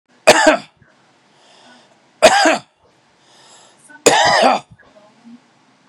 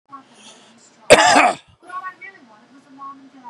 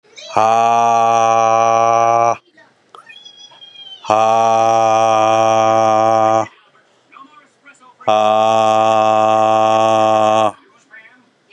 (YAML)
three_cough_length: 5.9 s
three_cough_amplitude: 32768
three_cough_signal_mean_std_ratio: 0.37
cough_length: 3.5 s
cough_amplitude: 32768
cough_signal_mean_std_ratio: 0.32
exhalation_length: 11.5 s
exhalation_amplitude: 32750
exhalation_signal_mean_std_ratio: 0.71
survey_phase: beta (2021-08-13 to 2022-03-07)
age: 45-64
gender: Male
wearing_mask: 'No'
symptom_change_to_sense_of_smell_or_taste: true
smoker_status: Never smoked
respiratory_condition_asthma: false
respiratory_condition_other: false
recruitment_source: REACT
submission_delay: 1 day
covid_test_result: Negative
covid_test_method: RT-qPCR